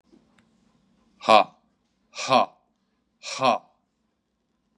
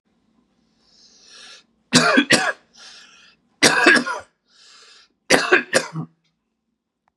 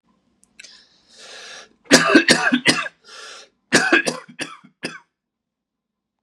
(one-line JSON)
{"exhalation_length": "4.8 s", "exhalation_amplitude": 26137, "exhalation_signal_mean_std_ratio": 0.25, "three_cough_length": "7.2 s", "three_cough_amplitude": 32767, "three_cough_signal_mean_std_ratio": 0.36, "cough_length": "6.2 s", "cough_amplitude": 32768, "cough_signal_mean_std_ratio": 0.35, "survey_phase": "beta (2021-08-13 to 2022-03-07)", "age": "45-64", "gender": "Male", "wearing_mask": "No", "symptom_cough_any": true, "symptom_onset": "9 days", "smoker_status": "Never smoked", "respiratory_condition_asthma": false, "respiratory_condition_other": false, "recruitment_source": "Test and Trace", "submission_delay": "3 days", "covid_test_result": "Negative", "covid_test_method": "ePCR"}